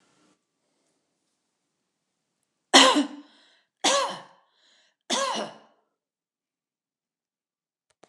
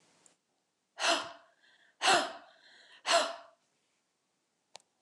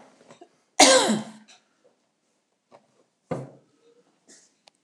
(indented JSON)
{
  "three_cough_length": "8.1 s",
  "three_cough_amplitude": 29203,
  "three_cough_signal_mean_std_ratio": 0.24,
  "exhalation_length": "5.0 s",
  "exhalation_amplitude": 6644,
  "exhalation_signal_mean_std_ratio": 0.32,
  "cough_length": "4.8 s",
  "cough_amplitude": 29203,
  "cough_signal_mean_std_ratio": 0.25,
  "survey_phase": "beta (2021-08-13 to 2022-03-07)",
  "age": "65+",
  "gender": "Female",
  "wearing_mask": "No",
  "symptom_none": true,
  "smoker_status": "Never smoked",
  "respiratory_condition_asthma": false,
  "respiratory_condition_other": false,
  "recruitment_source": "REACT",
  "submission_delay": "15 days",
  "covid_test_result": "Negative",
  "covid_test_method": "RT-qPCR",
  "influenza_a_test_result": "Negative",
  "influenza_b_test_result": "Negative"
}